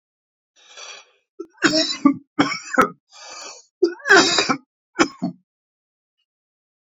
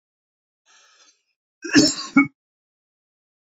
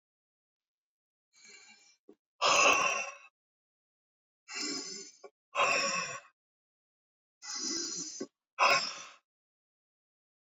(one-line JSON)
{"three_cough_length": "6.8 s", "three_cough_amplitude": 28523, "three_cough_signal_mean_std_ratio": 0.36, "cough_length": "3.6 s", "cough_amplitude": 27493, "cough_signal_mean_std_ratio": 0.25, "exhalation_length": "10.6 s", "exhalation_amplitude": 7480, "exhalation_signal_mean_std_ratio": 0.37, "survey_phase": "beta (2021-08-13 to 2022-03-07)", "age": "65+", "gender": "Male", "wearing_mask": "No", "symptom_none": true, "smoker_status": "Never smoked", "respiratory_condition_asthma": false, "respiratory_condition_other": false, "recruitment_source": "REACT", "submission_delay": "1 day", "covid_test_result": "Negative", "covid_test_method": "RT-qPCR"}